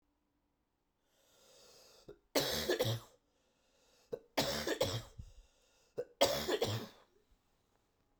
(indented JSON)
{
  "three_cough_length": "8.2 s",
  "three_cough_amplitude": 5406,
  "three_cough_signal_mean_std_ratio": 0.4,
  "survey_phase": "beta (2021-08-13 to 2022-03-07)",
  "age": "18-44",
  "gender": "Male",
  "wearing_mask": "No",
  "symptom_cough_any": true,
  "symptom_runny_or_blocked_nose": true,
  "symptom_sore_throat": true,
  "symptom_fatigue": true,
  "symptom_change_to_sense_of_smell_or_taste": true,
  "symptom_loss_of_taste": true,
  "symptom_other": true,
  "smoker_status": "Ex-smoker",
  "respiratory_condition_asthma": false,
  "respiratory_condition_other": false,
  "recruitment_source": "Test and Trace",
  "submission_delay": "2 days",
  "covid_test_result": "Positive",
  "covid_test_method": "LAMP"
}